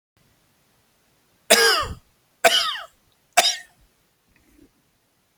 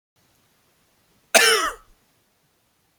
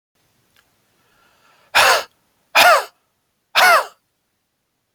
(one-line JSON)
{"three_cough_length": "5.4 s", "three_cough_amplitude": 32768, "three_cough_signal_mean_std_ratio": 0.31, "cough_length": "3.0 s", "cough_amplitude": 30356, "cough_signal_mean_std_ratio": 0.27, "exhalation_length": "4.9 s", "exhalation_amplitude": 31949, "exhalation_signal_mean_std_ratio": 0.33, "survey_phase": "beta (2021-08-13 to 2022-03-07)", "age": "45-64", "gender": "Male", "wearing_mask": "No", "symptom_none": true, "smoker_status": "Never smoked", "respiratory_condition_asthma": false, "respiratory_condition_other": false, "recruitment_source": "REACT", "submission_delay": "0 days", "covid_test_result": "Negative", "covid_test_method": "RT-qPCR", "influenza_a_test_result": "Unknown/Void", "influenza_b_test_result": "Unknown/Void"}